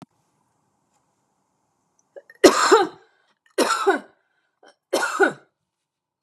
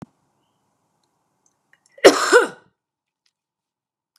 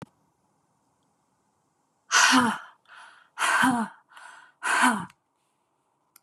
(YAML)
three_cough_length: 6.2 s
three_cough_amplitude: 32768
three_cough_signal_mean_std_ratio: 0.31
cough_length: 4.2 s
cough_amplitude: 32768
cough_signal_mean_std_ratio: 0.21
exhalation_length: 6.2 s
exhalation_amplitude: 15949
exhalation_signal_mean_std_ratio: 0.38
survey_phase: beta (2021-08-13 to 2022-03-07)
age: 45-64
gender: Female
wearing_mask: 'No'
symptom_none: true
smoker_status: Never smoked
respiratory_condition_asthma: false
respiratory_condition_other: false
recruitment_source: REACT
submission_delay: 3 days
covid_test_result: Negative
covid_test_method: RT-qPCR
influenza_a_test_result: Negative
influenza_b_test_result: Negative